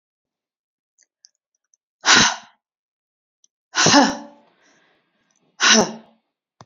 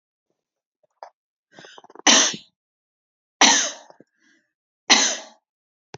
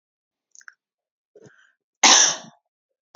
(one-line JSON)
{"exhalation_length": "6.7 s", "exhalation_amplitude": 32568, "exhalation_signal_mean_std_ratio": 0.3, "three_cough_length": "6.0 s", "three_cough_amplitude": 32768, "three_cough_signal_mean_std_ratio": 0.29, "cough_length": "3.2 s", "cough_amplitude": 32767, "cough_signal_mean_std_ratio": 0.25, "survey_phase": "beta (2021-08-13 to 2022-03-07)", "age": "18-44", "gender": "Female", "wearing_mask": "No", "symptom_none": true, "smoker_status": "Never smoked", "respiratory_condition_asthma": false, "respiratory_condition_other": false, "recruitment_source": "REACT", "submission_delay": "1 day", "covid_test_result": "Negative", "covid_test_method": "RT-qPCR"}